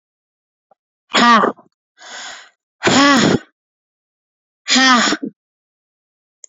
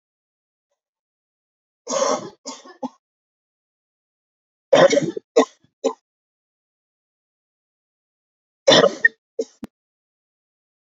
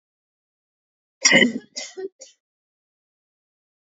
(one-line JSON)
{"exhalation_length": "6.5 s", "exhalation_amplitude": 29744, "exhalation_signal_mean_std_ratio": 0.4, "three_cough_length": "10.8 s", "three_cough_amplitude": 28584, "three_cough_signal_mean_std_ratio": 0.24, "cough_length": "3.9 s", "cough_amplitude": 30485, "cough_signal_mean_std_ratio": 0.24, "survey_phase": "beta (2021-08-13 to 2022-03-07)", "age": "18-44", "gender": "Female", "wearing_mask": "No", "symptom_cough_any": true, "smoker_status": "Never smoked", "respiratory_condition_asthma": false, "respiratory_condition_other": false, "recruitment_source": "REACT", "submission_delay": "3 days", "covid_test_result": "Negative", "covid_test_method": "RT-qPCR"}